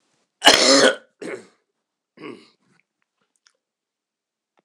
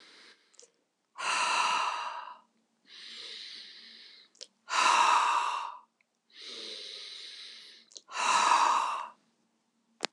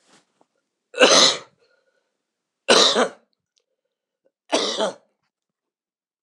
{"cough_length": "4.6 s", "cough_amplitude": 26028, "cough_signal_mean_std_ratio": 0.27, "exhalation_length": "10.1 s", "exhalation_amplitude": 12628, "exhalation_signal_mean_std_ratio": 0.49, "three_cough_length": "6.2 s", "three_cough_amplitude": 26028, "three_cough_signal_mean_std_ratio": 0.32, "survey_phase": "beta (2021-08-13 to 2022-03-07)", "age": "65+", "gender": "Male", "wearing_mask": "No", "symptom_cough_any": true, "symptom_abdominal_pain": true, "symptom_fatigue": true, "symptom_change_to_sense_of_smell_or_taste": true, "symptom_loss_of_taste": true, "smoker_status": "Ex-smoker", "respiratory_condition_asthma": false, "respiratory_condition_other": false, "recruitment_source": "Test and Trace", "submission_delay": "2 days", "covid_test_result": "Positive", "covid_test_method": "LAMP"}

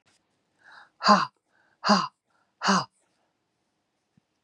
{"exhalation_length": "4.4 s", "exhalation_amplitude": 21555, "exhalation_signal_mean_std_ratio": 0.28, "survey_phase": "beta (2021-08-13 to 2022-03-07)", "age": "45-64", "gender": "Female", "wearing_mask": "No", "symptom_cough_any": true, "symptom_runny_or_blocked_nose": true, "symptom_shortness_of_breath": true, "symptom_fatigue": true, "symptom_fever_high_temperature": true, "symptom_headache": true, "symptom_onset": "4 days", "smoker_status": "Never smoked", "respiratory_condition_asthma": false, "respiratory_condition_other": false, "recruitment_source": "Test and Trace", "submission_delay": "2 days", "covid_test_result": "Positive", "covid_test_method": "ePCR"}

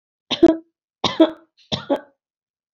{"cough_length": "2.7 s", "cough_amplitude": 25827, "cough_signal_mean_std_ratio": 0.3, "survey_phase": "beta (2021-08-13 to 2022-03-07)", "age": "65+", "gender": "Female", "wearing_mask": "No", "symptom_none": true, "smoker_status": "Never smoked", "respiratory_condition_asthma": false, "respiratory_condition_other": false, "recruitment_source": "REACT", "submission_delay": "-1 day", "covid_test_result": "Negative", "covid_test_method": "RT-qPCR", "influenza_a_test_result": "Negative", "influenza_b_test_result": "Negative"}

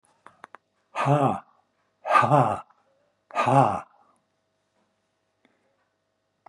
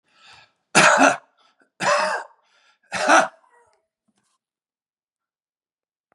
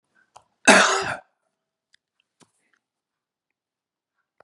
{"exhalation_length": "6.5 s", "exhalation_amplitude": 19335, "exhalation_signal_mean_std_ratio": 0.35, "three_cough_length": "6.1 s", "three_cough_amplitude": 28917, "three_cough_signal_mean_std_ratio": 0.33, "cough_length": "4.4 s", "cough_amplitude": 32766, "cough_signal_mean_std_ratio": 0.22, "survey_phase": "beta (2021-08-13 to 2022-03-07)", "age": "65+", "gender": "Male", "wearing_mask": "No", "symptom_none": true, "smoker_status": "Never smoked", "respiratory_condition_asthma": false, "respiratory_condition_other": false, "recruitment_source": "REACT", "submission_delay": "0 days", "covid_test_result": "Negative", "covid_test_method": "RT-qPCR", "influenza_a_test_result": "Negative", "influenza_b_test_result": "Negative"}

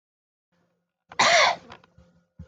{"cough_length": "2.5 s", "cough_amplitude": 14531, "cough_signal_mean_std_ratio": 0.33, "survey_phase": "beta (2021-08-13 to 2022-03-07)", "age": "45-64", "gender": "Female", "wearing_mask": "No", "symptom_none": true, "smoker_status": "Ex-smoker", "respiratory_condition_asthma": false, "respiratory_condition_other": false, "recruitment_source": "REACT", "submission_delay": "1 day", "covid_test_result": "Negative", "covid_test_method": "RT-qPCR"}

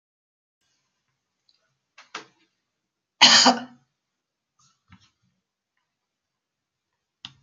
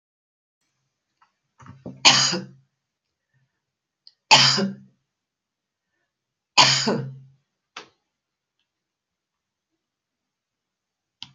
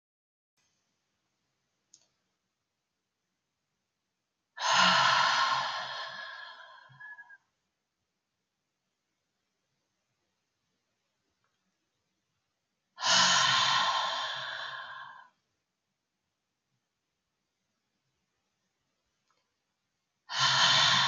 {"cough_length": "7.4 s", "cough_amplitude": 31409, "cough_signal_mean_std_ratio": 0.18, "three_cough_length": "11.3 s", "three_cough_amplitude": 32768, "three_cough_signal_mean_std_ratio": 0.24, "exhalation_length": "21.1 s", "exhalation_amplitude": 8755, "exhalation_signal_mean_std_ratio": 0.35, "survey_phase": "beta (2021-08-13 to 2022-03-07)", "age": "65+", "gender": "Female", "wearing_mask": "No", "symptom_none": true, "smoker_status": "Never smoked", "respiratory_condition_asthma": false, "respiratory_condition_other": false, "recruitment_source": "REACT", "submission_delay": "1 day", "covid_test_result": "Negative", "covid_test_method": "RT-qPCR", "influenza_a_test_result": "Unknown/Void", "influenza_b_test_result": "Unknown/Void"}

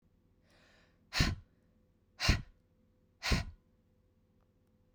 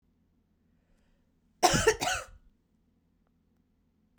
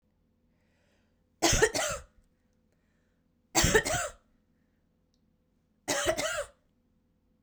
{"exhalation_length": "4.9 s", "exhalation_amplitude": 6974, "exhalation_signal_mean_std_ratio": 0.28, "cough_length": "4.2 s", "cough_amplitude": 13525, "cough_signal_mean_std_ratio": 0.26, "three_cough_length": "7.4 s", "three_cough_amplitude": 12897, "three_cough_signal_mean_std_ratio": 0.35, "survey_phase": "beta (2021-08-13 to 2022-03-07)", "age": "18-44", "gender": "Female", "wearing_mask": "No", "symptom_runny_or_blocked_nose": true, "symptom_change_to_sense_of_smell_or_taste": true, "smoker_status": "Never smoked", "respiratory_condition_asthma": false, "respiratory_condition_other": false, "recruitment_source": "Test and Trace", "submission_delay": "2 days", "covid_test_result": "Positive", "covid_test_method": "RT-qPCR", "covid_ct_value": 29.4, "covid_ct_gene": "N gene"}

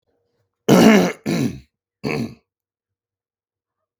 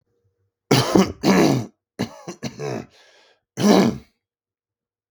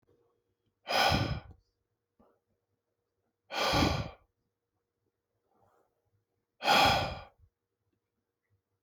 {"cough_length": "4.0 s", "cough_amplitude": 32767, "cough_signal_mean_std_ratio": 0.35, "three_cough_length": "5.1 s", "three_cough_amplitude": 32720, "three_cough_signal_mean_std_ratio": 0.42, "exhalation_length": "8.8 s", "exhalation_amplitude": 7901, "exhalation_signal_mean_std_ratio": 0.33, "survey_phase": "beta (2021-08-13 to 2022-03-07)", "age": "18-44", "gender": "Male", "wearing_mask": "No", "symptom_none": true, "smoker_status": "Ex-smoker", "respiratory_condition_asthma": false, "respiratory_condition_other": false, "recruitment_source": "REACT", "submission_delay": "0 days", "covid_test_result": "Negative", "covid_test_method": "RT-qPCR", "influenza_a_test_result": "Negative", "influenza_b_test_result": "Negative"}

